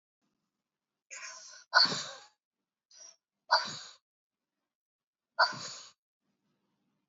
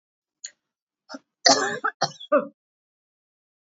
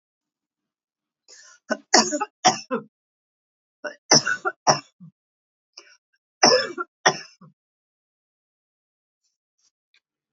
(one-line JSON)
{"exhalation_length": "7.1 s", "exhalation_amplitude": 10823, "exhalation_signal_mean_std_ratio": 0.24, "cough_length": "3.8 s", "cough_amplitude": 32767, "cough_signal_mean_std_ratio": 0.28, "three_cough_length": "10.3 s", "three_cough_amplitude": 30311, "three_cough_signal_mean_std_ratio": 0.25, "survey_phase": "beta (2021-08-13 to 2022-03-07)", "age": "45-64", "gender": "Female", "wearing_mask": "No", "symptom_none": true, "smoker_status": "Never smoked", "respiratory_condition_asthma": false, "respiratory_condition_other": false, "recruitment_source": "REACT", "submission_delay": "1 day", "covid_test_result": "Negative", "covid_test_method": "RT-qPCR"}